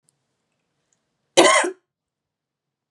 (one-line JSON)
{"cough_length": "2.9 s", "cough_amplitude": 31659, "cough_signal_mean_std_ratio": 0.26, "survey_phase": "beta (2021-08-13 to 2022-03-07)", "age": "18-44", "gender": "Female", "wearing_mask": "No", "symptom_none": true, "smoker_status": "Never smoked", "respiratory_condition_asthma": false, "respiratory_condition_other": false, "recruitment_source": "REACT", "submission_delay": "2 days", "covid_test_result": "Negative", "covid_test_method": "RT-qPCR", "influenza_a_test_result": "Unknown/Void", "influenza_b_test_result": "Unknown/Void"}